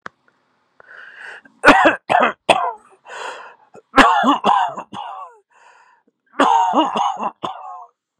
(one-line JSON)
{"three_cough_length": "8.2 s", "three_cough_amplitude": 32768, "three_cough_signal_mean_std_ratio": 0.45, "survey_phase": "beta (2021-08-13 to 2022-03-07)", "age": "18-44", "gender": "Male", "wearing_mask": "No", "symptom_runny_or_blocked_nose": true, "symptom_shortness_of_breath": true, "symptom_fatigue": true, "symptom_headache": true, "symptom_change_to_sense_of_smell_or_taste": true, "symptom_loss_of_taste": true, "smoker_status": "Ex-smoker", "respiratory_condition_asthma": false, "respiratory_condition_other": false, "recruitment_source": "Test and Trace", "submission_delay": "2 days", "covid_test_result": "Positive", "covid_test_method": "RT-qPCR", "covid_ct_value": 15.6, "covid_ct_gene": "ORF1ab gene", "covid_ct_mean": 15.6, "covid_viral_load": "7500000 copies/ml", "covid_viral_load_category": "High viral load (>1M copies/ml)"}